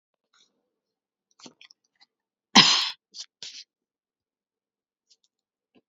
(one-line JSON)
{"cough_length": "5.9 s", "cough_amplitude": 30854, "cough_signal_mean_std_ratio": 0.18, "survey_phase": "beta (2021-08-13 to 2022-03-07)", "age": "18-44", "gender": "Female", "wearing_mask": "Yes", "symptom_none": true, "smoker_status": "Never smoked", "respiratory_condition_asthma": false, "respiratory_condition_other": false, "recruitment_source": "REACT", "submission_delay": "14 days", "covid_test_result": "Negative", "covid_test_method": "RT-qPCR"}